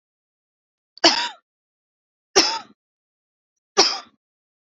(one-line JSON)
{"three_cough_length": "4.7 s", "three_cough_amplitude": 31780, "three_cough_signal_mean_std_ratio": 0.26, "survey_phase": "alpha (2021-03-01 to 2021-08-12)", "age": "18-44", "gender": "Female", "wearing_mask": "No", "symptom_none": true, "smoker_status": "Never smoked", "respiratory_condition_asthma": false, "respiratory_condition_other": false, "recruitment_source": "REACT", "submission_delay": "1 day", "covid_test_result": "Negative", "covid_test_method": "RT-qPCR"}